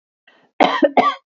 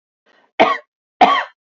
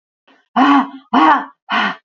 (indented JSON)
{
  "cough_length": "1.4 s",
  "cough_amplitude": 27562,
  "cough_signal_mean_std_ratio": 0.43,
  "three_cough_length": "1.7 s",
  "three_cough_amplitude": 27964,
  "three_cough_signal_mean_std_ratio": 0.37,
  "exhalation_length": "2.0 s",
  "exhalation_amplitude": 32767,
  "exhalation_signal_mean_std_ratio": 0.55,
  "survey_phase": "alpha (2021-03-01 to 2021-08-12)",
  "age": "45-64",
  "gender": "Female",
  "wearing_mask": "No",
  "symptom_none": true,
  "smoker_status": "Never smoked",
  "respiratory_condition_asthma": false,
  "respiratory_condition_other": false,
  "recruitment_source": "REACT",
  "submission_delay": "3 days",
  "covid_test_result": "Negative",
  "covid_test_method": "RT-qPCR"
}